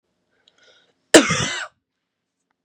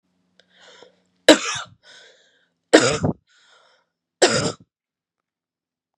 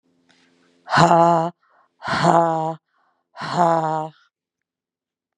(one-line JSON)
{"cough_length": "2.6 s", "cough_amplitude": 32768, "cough_signal_mean_std_ratio": 0.24, "three_cough_length": "6.0 s", "three_cough_amplitude": 32768, "three_cough_signal_mean_std_ratio": 0.26, "exhalation_length": "5.4 s", "exhalation_amplitude": 32767, "exhalation_signal_mean_std_ratio": 0.42, "survey_phase": "beta (2021-08-13 to 2022-03-07)", "age": "18-44", "gender": "Female", "wearing_mask": "No", "symptom_cough_any": true, "symptom_runny_or_blocked_nose": true, "symptom_sore_throat": true, "symptom_diarrhoea": true, "symptom_fatigue": true, "symptom_headache": true, "symptom_onset": "4 days", "smoker_status": "Never smoked", "respiratory_condition_asthma": false, "respiratory_condition_other": false, "recruitment_source": "Test and Trace", "submission_delay": "2 days", "covid_test_result": "Positive", "covid_test_method": "RT-qPCR", "covid_ct_value": 20.4, "covid_ct_gene": "ORF1ab gene", "covid_ct_mean": 20.8, "covid_viral_load": "150000 copies/ml", "covid_viral_load_category": "Low viral load (10K-1M copies/ml)"}